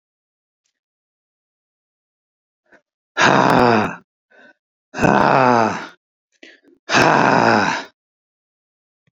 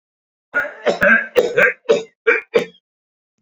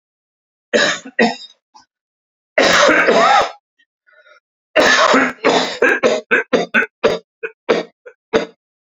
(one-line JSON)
{"exhalation_length": "9.1 s", "exhalation_amplitude": 32767, "exhalation_signal_mean_std_ratio": 0.4, "cough_length": "3.4 s", "cough_amplitude": 27540, "cough_signal_mean_std_ratio": 0.47, "three_cough_length": "8.9 s", "three_cough_amplitude": 32768, "three_cough_signal_mean_std_ratio": 0.52, "survey_phase": "beta (2021-08-13 to 2022-03-07)", "age": "65+", "gender": "Male", "wearing_mask": "No", "symptom_cough_any": true, "symptom_runny_or_blocked_nose": true, "symptom_fatigue": true, "smoker_status": "Never smoked", "respiratory_condition_asthma": false, "respiratory_condition_other": false, "recruitment_source": "REACT", "submission_delay": "1 day", "covid_test_result": "Negative", "covid_test_method": "RT-qPCR", "influenza_a_test_result": "Negative", "influenza_b_test_result": "Negative"}